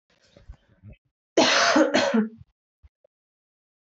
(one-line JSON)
{"three_cough_length": "3.8 s", "three_cough_amplitude": 16533, "three_cough_signal_mean_std_ratio": 0.4, "survey_phase": "beta (2021-08-13 to 2022-03-07)", "age": "18-44", "gender": "Female", "wearing_mask": "No", "symptom_cough_any": true, "symptom_new_continuous_cough": true, "symptom_runny_or_blocked_nose": true, "symptom_onset": "4 days", "smoker_status": "Never smoked", "respiratory_condition_asthma": false, "respiratory_condition_other": false, "recruitment_source": "Test and Trace", "submission_delay": "2 days", "covid_test_result": "Positive", "covid_test_method": "RT-qPCR", "covid_ct_value": 19.9, "covid_ct_gene": "ORF1ab gene", "covid_ct_mean": 20.2, "covid_viral_load": "240000 copies/ml", "covid_viral_load_category": "Low viral load (10K-1M copies/ml)"}